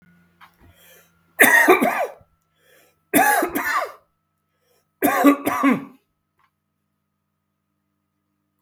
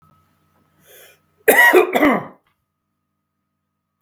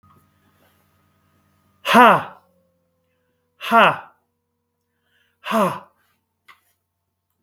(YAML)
three_cough_length: 8.6 s
three_cough_amplitude: 32768
three_cough_signal_mean_std_ratio: 0.38
cough_length: 4.0 s
cough_amplitude: 32768
cough_signal_mean_std_ratio: 0.33
exhalation_length: 7.4 s
exhalation_amplitude: 32768
exhalation_signal_mean_std_ratio: 0.26
survey_phase: beta (2021-08-13 to 2022-03-07)
age: 65+
gender: Male
wearing_mask: 'No'
symptom_none: true
smoker_status: Ex-smoker
respiratory_condition_asthma: false
respiratory_condition_other: false
recruitment_source: REACT
submission_delay: 3 days
covid_test_result: Negative
covid_test_method: RT-qPCR
influenza_a_test_result: Negative
influenza_b_test_result: Negative